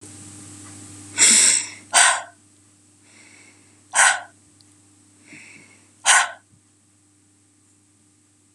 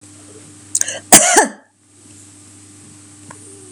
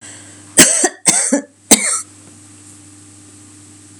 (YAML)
exhalation_length: 8.5 s
exhalation_amplitude: 32767
exhalation_signal_mean_std_ratio: 0.33
cough_length: 3.7 s
cough_amplitude: 32768
cough_signal_mean_std_ratio: 0.3
three_cough_length: 4.0 s
three_cough_amplitude: 32768
three_cough_signal_mean_std_ratio: 0.4
survey_phase: beta (2021-08-13 to 2022-03-07)
age: 65+
gender: Female
wearing_mask: 'No'
symptom_change_to_sense_of_smell_or_taste: true
symptom_loss_of_taste: true
smoker_status: Never smoked
respiratory_condition_asthma: false
respiratory_condition_other: false
recruitment_source: REACT
submission_delay: 2 days
covid_test_result: Negative
covid_test_method: RT-qPCR
influenza_a_test_result: Negative
influenza_b_test_result: Negative